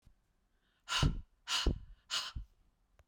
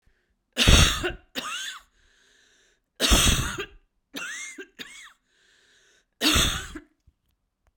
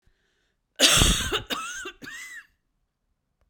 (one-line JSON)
{"exhalation_length": "3.1 s", "exhalation_amplitude": 4204, "exhalation_signal_mean_std_ratio": 0.41, "three_cough_length": "7.8 s", "three_cough_amplitude": 24850, "three_cough_signal_mean_std_ratio": 0.38, "cough_length": "3.5 s", "cough_amplitude": 25945, "cough_signal_mean_std_ratio": 0.38, "survey_phase": "beta (2021-08-13 to 2022-03-07)", "age": "45-64", "gender": "Female", "wearing_mask": "No", "symptom_new_continuous_cough": true, "symptom_sore_throat": true, "symptom_fatigue": true, "symptom_headache": true, "symptom_onset": "3 days", "smoker_status": "Ex-smoker", "respiratory_condition_asthma": false, "respiratory_condition_other": false, "recruitment_source": "Test and Trace", "submission_delay": "0 days", "covid_test_result": "Negative", "covid_test_method": "RT-qPCR"}